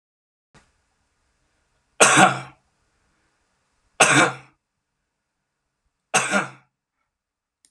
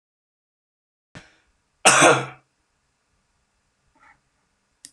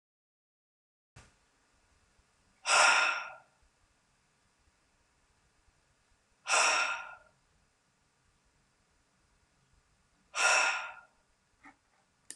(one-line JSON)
{"three_cough_length": "7.7 s", "three_cough_amplitude": 32767, "three_cough_signal_mean_std_ratio": 0.27, "cough_length": "4.9 s", "cough_amplitude": 30545, "cough_signal_mean_std_ratio": 0.22, "exhalation_length": "12.4 s", "exhalation_amplitude": 9153, "exhalation_signal_mean_std_ratio": 0.29, "survey_phase": "alpha (2021-03-01 to 2021-08-12)", "age": "45-64", "gender": "Male", "wearing_mask": "No", "symptom_none": true, "smoker_status": "Ex-smoker", "respiratory_condition_asthma": false, "respiratory_condition_other": false, "recruitment_source": "REACT", "submission_delay": "1 day", "covid_test_result": "Negative", "covid_test_method": "RT-qPCR"}